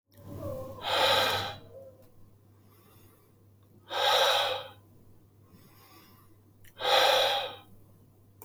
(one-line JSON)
{"exhalation_length": "8.4 s", "exhalation_amplitude": 8467, "exhalation_signal_mean_std_ratio": 0.47, "survey_phase": "alpha (2021-03-01 to 2021-08-12)", "age": "45-64", "gender": "Male", "wearing_mask": "No", "symptom_none": true, "symptom_fatigue": true, "smoker_status": "Never smoked", "respiratory_condition_asthma": true, "respiratory_condition_other": false, "recruitment_source": "REACT", "submission_delay": "2 days", "covid_test_result": "Negative", "covid_test_method": "RT-qPCR"}